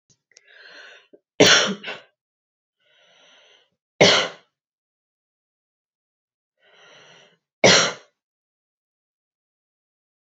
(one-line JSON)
{"three_cough_length": "10.3 s", "three_cough_amplitude": 29619, "three_cough_signal_mean_std_ratio": 0.23, "survey_phase": "beta (2021-08-13 to 2022-03-07)", "age": "18-44", "gender": "Female", "wearing_mask": "No", "symptom_sore_throat": true, "symptom_fatigue": true, "symptom_headache": true, "symptom_change_to_sense_of_smell_or_taste": true, "symptom_loss_of_taste": true, "symptom_other": true, "smoker_status": "Never smoked", "respiratory_condition_asthma": true, "respiratory_condition_other": false, "recruitment_source": "Test and Trace", "submission_delay": "2 days", "covid_test_result": "Positive", "covid_test_method": "LFT"}